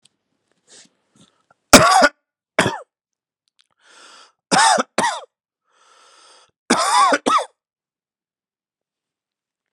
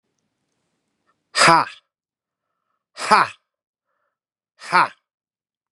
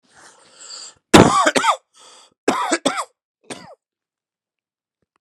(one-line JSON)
{"three_cough_length": "9.7 s", "three_cough_amplitude": 32768, "three_cough_signal_mean_std_ratio": 0.31, "exhalation_length": "5.7 s", "exhalation_amplitude": 32767, "exhalation_signal_mean_std_ratio": 0.25, "cough_length": "5.2 s", "cough_amplitude": 32768, "cough_signal_mean_std_ratio": 0.32, "survey_phase": "beta (2021-08-13 to 2022-03-07)", "age": "18-44", "gender": "Male", "wearing_mask": "No", "symptom_cough_any": true, "symptom_runny_or_blocked_nose": true, "smoker_status": "Never smoked", "respiratory_condition_asthma": false, "respiratory_condition_other": false, "recruitment_source": "Test and Trace", "submission_delay": "0 days", "covid_test_result": "Positive", "covid_test_method": "LFT"}